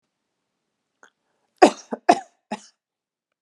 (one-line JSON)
{"cough_length": "3.4 s", "cough_amplitude": 32768, "cough_signal_mean_std_ratio": 0.17, "survey_phase": "alpha (2021-03-01 to 2021-08-12)", "age": "45-64", "gender": "Female", "wearing_mask": "No", "symptom_none": true, "smoker_status": "Never smoked", "respiratory_condition_asthma": false, "respiratory_condition_other": false, "recruitment_source": "REACT", "submission_delay": "1 day", "covid_test_result": "Negative", "covid_test_method": "RT-qPCR"}